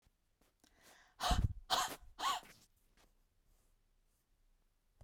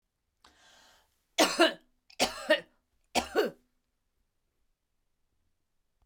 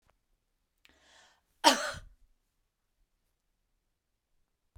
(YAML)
exhalation_length: 5.0 s
exhalation_amplitude: 3377
exhalation_signal_mean_std_ratio: 0.32
three_cough_length: 6.1 s
three_cough_amplitude: 12870
three_cough_signal_mean_std_ratio: 0.27
cough_length: 4.8 s
cough_amplitude: 15316
cough_signal_mean_std_ratio: 0.16
survey_phase: beta (2021-08-13 to 2022-03-07)
age: 45-64
gender: Female
wearing_mask: 'No'
symptom_none: true
symptom_onset: 8 days
smoker_status: Never smoked
respiratory_condition_asthma: false
respiratory_condition_other: false
recruitment_source: REACT
submission_delay: 1 day
covid_test_result: Negative
covid_test_method: RT-qPCR